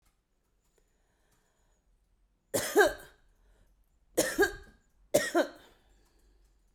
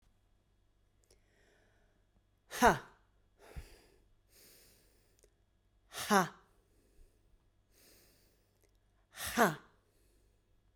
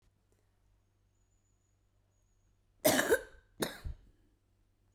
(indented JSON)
{
  "three_cough_length": "6.7 s",
  "three_cough_amplitude": 9663,
  "three_cough_signal_mean_std_ratio": 0.29,
  "exhalation_length": "10.8 s",
  "exhalation_amplitude": 8306,
  "exhalation_signal_mean_std_ratio": 0.21,
  "cough_length": "4.9 s",
  "cough_amplitude": 6520,
  "cough_signal_mean_std_ratio": 0.25,
  "survey_phase": "beta (2021-08-13 to 2022-03-07)",
  "age": "45-64",
  "gender": "Female",
  "wearing_mask": "No",
  "symptom_cough_any": true,
  "symptom_shortness_of_breath": true,
  "symptom_abdominal_pain": true,
  "symptom_diarrhoea": true,
  "symptom_fatigue": true,
  "symptom_fever_high_temperature": true,
  "symptom_headache": true,
  "smoker_status": "Never smoked",
  "respiratory_condition_asthma": true,
  "respiratory_condition_other": false,
  "recruitment_source": "Test and Trace",
  "submission_delay": "2 days",
  "covid_test_result": "Positive",
  "covid_test_method": "RT-qPCR"
}